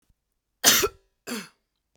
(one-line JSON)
{"cough_length": "2.0 s", "cough_amplitude": 29444, "cough_signal_mean_std_ratio": 0.3, "survey_phase": "beta (2021-08-13 to 2022-03-07)", "age": "18-44", "gender": "Female", "wearing_mask": "No", "symptom_cough_any": true, "smoker_status": "Ex-smoker", "respiratory_condition_asthma": false, "respiratory_condition_other": false, "recruitment_source": "Test and Trace", "submission_delay": "1 day", "covid_test_result": "Negative", "covid_test_method": "ePCR"}